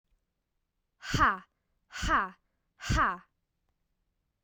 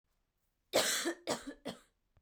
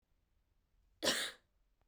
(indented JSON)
{
  "exhalation_length": "4.4 s",
  "exhalation_amplitude": 9077,
  "exhalation_signal_mean_std_ratio": 0.35,
  "three_cough_length": "2.2 s",
  "three_cough_amplitude": 4434,
  "three_cough_signal_mean_std_ratio": 0.43,
  "cough_length": "1.9 s",
  "cough_amplitude": 3341,
  "cough_signal_mean_std_ratio": 0.31,
  "survey_phase": "beta (2021-08-13 to 2022-03-07)",
  "age": "18-44",
  "gender": "Female",
  "wearing_mask": "No",
  "symptom_cough_any": true,
  "smoker_status": "Never smoked",
  "respiratory_condition_asthma": false,
  "respiratory_condition_other": false,
  "recruitment_source": "REACT",
  "submission_delay": "0 days",
  "covid_test_result": "Negative",
  "covid_test_method": "RT-qPCR"
}